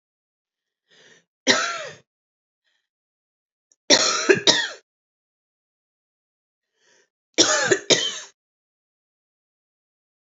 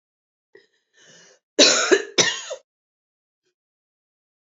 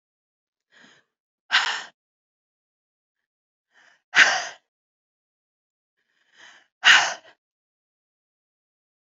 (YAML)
three_cough_length: 10.3 s
three_cough_amplitude: 32768
three_cough_signal_mean_std_ratio: 0.29
cough_length: 4.4 s
cough_amplitude: 31823
cough_signal_mean_std_ratio: 0.28
exhalation_length: 9.1 s
exhalation_amplitude: 29969
exhalation_signal_mean_std_ratio: 0.21
survey_phase: beta (2021-08-13 to 2022-03-07)
age: 45-64
gender: Female
wearing_mask: 'No'
symptom_cough_any: true
symptom_runny_or_blocked_nose: true
symptom_sore_throat: true
symptom_fatigue: true
symptom_headache: true
symptom_other: true
symptom_onset: 2 days
smoker_status: Ex-smoker
respiratory_condition_asthma: false
respiratory_condition_other: false
recruitment_source: Test and Trace
submission_delay: 1 day
covid_test_result: Positive
covid_test_method: RT-qPCR
covid_ct_value: 34.8
covid_ct_gene: ORF1ab gene
covid_ct_mean: 34.8
covid_viral_load: 3.8 copies/ml
covid_viral_load_category: Minimal viral load (< 10K copies/ml)